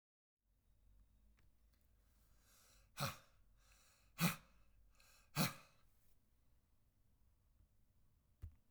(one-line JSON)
{"exhalation_length": "8.7 s", "exhalation_amplitude": 2260, "exhalation_signal_mean_std_ratio": 0.24, "survey_phase": "beta (2021-08-13 to 2022-03-07)", "age": "18-44", "gender": "Male", "wearing_mask": "No", "symptom_none": true, "smoker_status": "Current smoker (e-cigarettes or vapes only)", "respiratory_condition_asthma": false, "respiratory_condition_other": false, "recruitment_source": "REACT", "submission_delay": "4 days", "covid_test_result": "Negative", "covid_test_method": "RT-qPCR"}